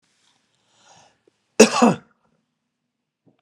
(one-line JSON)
{"cough_length": "3.4 s", "cough_amplitude": 32768, "cough_signal_mean_std_ratio": 0.21, "survey_phase": "beta (2021-08-13 to 2022-03-07)", "age": "65+", "gender": "Male", "wearing_mask": "No", "symptom_runny_or_blocked_nose": true, "symptom_abdominal_pain": true, "symptom_onset": "11 days", "smoker_status": "Never smoked", "respiratory_condition_asthma": false, "respiratory_condition_other": false, "recruitment_source": "REACT", "submission_delay": "2 days", "covid_test_result": "Negative", "covid_test_method": "RT-qPCR"}